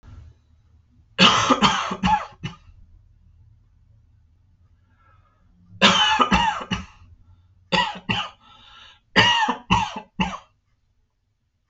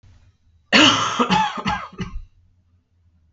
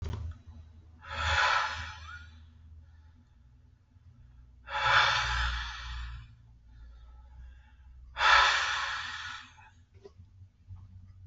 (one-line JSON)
{"three_cough_length": "11.7 s", "three_cough_amplitude": 31795, "three_cough_signal_mean_std_ratio": 0.41, "cough_length": "3.3 s", "cough_amplitude": 30319, "cough_signal_mean_std_ratio": 0.45, "exhalation_length": "11.3 s", "exhalation_amplitude": 10407, "exhalation_signal_mean_std_ratio": 0.48, "survey_phase": "alpha (2021-03-01 to 2021-08-12)", "age": "18-44", "gender": "Male", "wearing_mask": "No", "symptom_none": true, "smoker_status": "Never smoked", "respiratory_condition_asthma": false, "respiratory_condition_other": false, "recruitment_source": "REACT", "submission_delay": "1 day", "covid_test_result": "Negative", "covid_test_method": "RT-qPCR"}